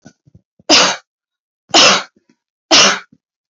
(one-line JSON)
{"three_cough_length": "3.5 s", "three_cough_amplitude": 32768, "three_cough_signal_mean_std_ratio": 0.4, "survey_phase": "beta (2021-08-13 to 2022-03-07)", "age": "45-64", "gender": "Female", "wearing_mask": "No", "symptom_runny_or_blocked_nose": true, "smoker_status": "Never smoked", "respiratory_condition_asthma": false, "respiratory_condition_other": false, "recruitment_source": "REACT", "submission_delay": "6 days", "covid_test_result": "Negative", "covid_test_method": "RT-qPCR", "covid_ct_value": 47.0, "covid_ct_gene": "N gene"}